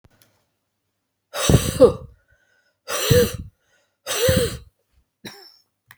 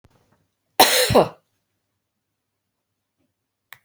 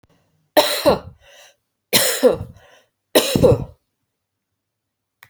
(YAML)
exhalation_length: 6.0 s
exhalation_amplitude: 27311
exhalation_signal_mean_std_ratio: 0.36
cough_length: 3.8 s
cough_amplitude: 31518
cough_signal_mean_std_ratio: 0.26
three_cough_length: 5.3 s
three_cough_amplitude: 32767
three_cough_signal_mean_std_ratio: 0.37
survey_phase: beta (2021-08-13 to 2022-03-07)
age: 45-64
gender: Female
wearing_mask: 'No'
symptom_runny_or_blocked_nose: true
symptom_fever_high_temperature: true
symptom_headache: true
smoker_status: Never smoked
respiratory_condition_asthma: false
respiratory_condition_other: false
recruitment_source: Test and Trace
submission_delay: 1 day
covid_test_result: Positive
covid_test_method: RT-qPCR
covid_ct_value: 18.6
covid_ct_gene: ORF1ab gene
covid_ct_mean: 19.9
covid_viral_load: 310000 copies/ml
covid_viral_load_category: Low viral load (10K-1M copies/ml)